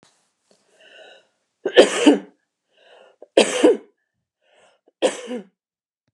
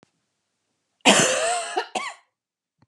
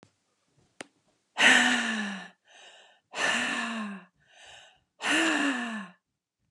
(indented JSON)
{
  "three_cough_length": "6.1 s",
  "three_cough_amplitude": 32768,
  "three_cough_signal_mean_std_ratio": 0.29,
  "cough_length": "2.9 s",
  "cough_amplitude": 28862,
  "cough_signal_mean_std_ratio": 0.4,
  "exhalation_length": "6.5 s",
  "exhalation_amplitude": 15943,
  "exhalation_signal_mean_std_ratio": 0.47,
  "survey_phase": "beta (2021-08-13 to 2022-03-07)",
  "age": "45-64",
  "gender": "Female",
  "wearing_mask": "No",
  "symptom_none": true,
  "smoker_status": "Ex-smoker",
  "respiratory_condition_asthma": false,
  "respiratory_condition_other": false,
  "recruitment_source": "REACT",
  "submission_delay": "2 days",
  "covid_test_result": "Negative",
  "covid_test_method": "RT-qPCR",
  "influenza_a_test_result": "Negative",
  "influenza_b_test_result": "Negative"
}